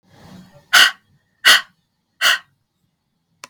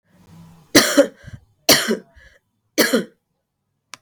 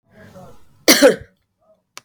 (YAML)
exhalation_length: 3.5 s
exhalation_amplitude: 32768
exhalation_signal_mean_std_ratio: 0.3
three_cough_length: 4.0 s
three_cough_amplitude: 32768
three_cough_signal_mean_std_ratio: 0.34
cough_length: 2.0 s
cough_amplitude: 32768
cough_signal_mean_std_ratio: 0.3
survey_phase: beta (2021-08-13 to 2022-03-07)
age: 45-64
gender: Female
wearing_mask: 'No'
symptom_cough_any: true
symptom_runny_or_blocked_nose: true
symptom_sore_throat: true
symptom_fatigue: true
symptom_onset: 3 days
smoker_status: Never smoked
respiratory_condition_asthma: false
respiratory_condition_other: false
recruitment_source: Test and Trace
submission_delay: 2 days
covid_test_result: Positive
covid_test_method: RT-qPCR
covid_ct_value: 13.9
covid_ct_gene: N gene
covid_ct_mean: 13.9
covid_viral_load: 27000000 copies/ml
covid_viral_load_category: High viral load (>1M copies/ml)